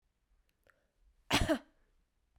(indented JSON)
{
  "cough_length": "2.4 s",
  "cough_amplitude": 5521,
  "cough_signal_mean_std_ratio": 0.27,
  "survey_phase": "beta (2021-08-13 to 2022-03-07)",
  "age": "18-44",
  "gender": "Female",
  "wearing_mask": "No",
  "symptom_runny_or_blocked_nose": true,
  "symptom_onset": "3 days",
  "smoker_status": "Never smoked",
  "respiratory_condition_asthma": true,
  "respiratory_condition_other": false,
  "recruitment_source": "REACT",
  "submission_delay": "1 day",
  "covid_test_result": "Negative",
  "covid_test_method": "RT-qPCR",
  "influenza_a_test_result": "Negative",
  "influenza_b_test_result": "Negative"
}